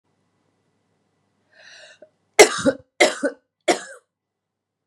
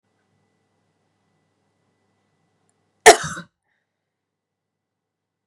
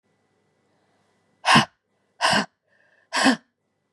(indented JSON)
{
  "three_cough_length": "4.9 s",
  "three_cough_amplitude": 32768,
  "three_cough_signal_mean_std_ratio": 0.23,
  "cough_length": "5.5 s",
  "cough_amplitude": 32768,
  "cough_signal_mean_std_ratio": 0.12,
  "exhalation_length": "3.9 s",
  "exhalation_amplitude": 23947,
  "exhalation_signal_mean_std_ratio": 0.31,
  "survey_phase": "beta (2021-08-13 to 2022-03-07)",
  "age": "45-64",
  "gender": "Female",
  "wearing_mask": "No",
  "symptom_cough_any": true,
  "symptom_new_continuous_cough": true,
  "symptom_shortness_of_breath": true,
  "symptom_sore_throat": true,
  "symptom_fatigue": true,
  "symptom_fever_high_temperature": true,
  "symptom_headache": true,
  "symptom_onset": "2 days",
  "smoker_status": "Never smoked",
  "respiratory_condition_asthma": false,
  "respiratory_condition_other": false,
  "recruitment_source": "Test and Trace",
  "submission_delay": "1 day",
  "covid_test_result": "Positive",
  "covid_test_method": "RT-qPCR",
  "covid_ct_value": 27.6,
  "covid_ct_gene": "N gene"
}